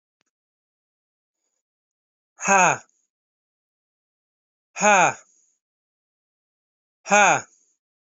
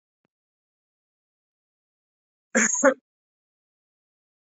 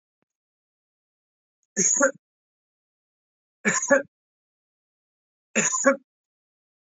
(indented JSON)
{
  "exhalation_length": "8.1 s",
  "exhalation_amplitude": 23596,
  "exhalation_signal_mean_std_ratio": 0.25,
  "cough_length": "4.5 s",
  "cough_amplitude": 18947,
  "cough_signal_mean_std_ratio": 0.21,
  "three_cough_length": "7.0 s",
  "three_cough_amplitude": 22392,
  "three_cough_signal_mean_std_ratio": 0.29,
  "survey_phase": "alpha (2021-03-01 to 2021-08-12)",
  "age": "45-64",
  "gender": "Female",
  "wearing_mask": "No",
  "symptom_change_to_sense_of_smell_or_taste": true,
  "symptom_onset": "7 days",
  "smoker_status": "Never smoked",
  "respiratory_condition_asthma": false,
  "respiratory_condition_other": false,
  "recruitment_source": "Test and Trace",
  "submission_delay": "2 days",
  "covid_test_result": "Positive",
  "covid_test_method": "RT-qPCR",
  "covid_ct_value": 22.2,
  "covid_ct_gene": "ORF1ab gene"
}